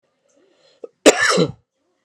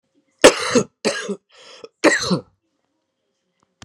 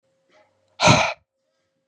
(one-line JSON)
{"cough_length": "2.0 s", "cough_amplitude": 32768, "cough_signal_mean_std_ratio": 0.33, "three_cough_length": "3.8 s", "three_cough_amplitude": 32768, "three_cough_signal_mean_std_ratio": 0.32, "exhalation_length": "1.9 s", "exhalation_amplitude": 26394, "exhalation_signal_mean_std_ratio": 0.31, "survey_phase": "beta (2021-08-13 to 2022-03-07)", "age": "18-44", "gender": "Male", "wearing_mask": "No", "symptom_cough_any": true, "symptom_runny_or_blocked_nose": true, "symptom_headache": true, "symptom_onset": "5 days", "smoker_status": "Current smoker (1 to 10 cigarettes per day)", "respiratory_condition_asthma": false, "respiratory_condition_other": false, "recruitment_source": "Test and Trace", "submission_delay": "2 days", "covid_test_result": "Positive", "covid_test_method": "RT-qPCR", "covid_ct_value": 30.3, "covid_ct_gene": "ORF1ab gene", "covid_ct_mean": 30.9, "covid_viral_load": "75 copies/ml", "covid_viral_load_category": "Minimal viral load (< 10K copies/ml)"}